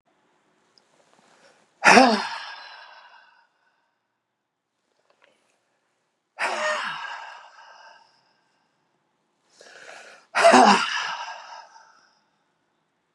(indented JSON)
{
  "exhalation_length": "13.1 s",
  "exhalation_amplitude": 32767,
  "exhalation_signal_mean_std_ratio": 0.27,
  "survey_phase": "beta (2021-08-13 to 2022-03-07)",
  "age": "65+",
  "gender": "Male",
  "wearing_mask": "No",
  "symptom_none": true,
  "smoker_status": "Ex-smoker",
  "respiratory_condition_asthma": false,
  "respiratory_condition_other": true,
  "recruitment_source": "REACT",
  "submission_delay": "1 day",
  "covid_test_result": "Negative",
  "covid_test_method": "RT-qPCR",
  "influenza_a_test_result": "Negative",
  "influenza_b_test_result": "Negative"
}